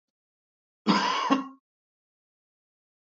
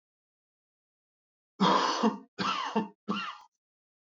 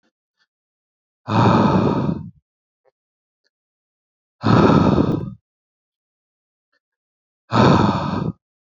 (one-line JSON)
{"cough_length": "3.2 s", "cough_amplitude": 13371, "cough_signal_mean_std_ratio": 0.33, "three_cough_length": "4.1 s", "three_cough_amplitude": 7950, "three_cough_signal_mean_std_ratio": 0.43, "exhalation_length": "8.8 s", "exhalation_amplitude": 27848, "exhalation_signal_mean_std_ratio": 0.43, "survey_phase": "beta (2021-08-13 to 2022-03-07)", "age": "18-44", "gender": "Male", "wearing_mask": "No", "symptom_none": true, "smoker_status": "Never smoked", "respiratory_condition_asthma": false, "respiratory_condition_other": false, "recruitment_source": "REACT", "submission_delay": "0 days", "covid_test_result": "Negative", "covid_test_method": "RT-qPCR", "influenza_a_test_result": "Negative", "influenza_b_test_result": "Negative"}